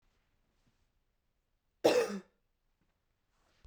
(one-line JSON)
{"cough_length": "3.7 s", "cough_amplitude": 6948, "cough_signal_mean_std_ratio": 0.22, "survey_phase": "beta (2021-08-13 to 2022-03-07)", "age": "18-44", "gender": "Female", "wearing_mask": "No", "symptom_cough_any": true, "symptom_runny_or_blocked_nose": true, "symptom_fatigue": true, "symptom_headache": true, "symptom_change_to_sense_of_smell_or_taste": true, "smoker_status": "Never smoked", "respiratory_condition_asthma": false, "respiratory_condition_other": false, "recruitment_source": "Test and Trace", "submission_delay": "1 day", "covid_test_result": "Positive", "covid_test_method": "LFT"}